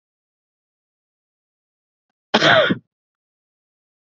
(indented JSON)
{
  "cough_length": "4.0 s",
  "cough_amplitude": 27508,
  "cough_signal_mean_std_ratio": 0.24,
  "survey_phase": "beta (2021-08-13 to 2022-03-07)",
  "age": "45-64",
  "gender": "Male",
  "wearing_mask": "No",
  "symptom_cough_any": true,
  "symptom_runny_or_blocked_nose": true,
  "symptom_sore_throat": true,
  "symptom_fatigue": true,
  "symptom_change_to_sense_of_smell_or_taste": true,
  "symptom_loss_of_taste": true,
  "symptom_other": true,
  "symptom_onset": "3 days",
  "smoker_status": "Ex-smoker",
  "respiratory_condition_asthma": false,
  "respiratory_condition_other": false,
  "recruitment_source": "Test and Trace",
  "submission_delay": "1 day",
  "covid_test_result": "Positive",
  "covid_test_method": "RT-qPCR",
  "covid_ct_value": 23.5,
  "covid_ct_gene": "ORF1ab gene"
}